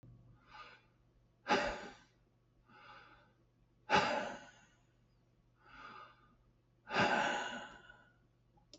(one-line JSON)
{"exhalation_length": "8.8 s", "exhalation_amplitude": 4818, "exhalation_signal_mean_std_ratio": 0.36, "survey_phase": "beta (2021-08-13 to 2022-03-07)", "age": "65+", "gender": "Male", "wearing_mask": "No", "symptom_none": true, "smoker_status": "Ex-smoker", "respiratory_condition_asthma": false, "respiratory_condition_other": false, "recruitment_source": "REACT", "submission_delay": "2 days", "covid_test_result": "Negative", "covid_test_method": "RT-qPCR"}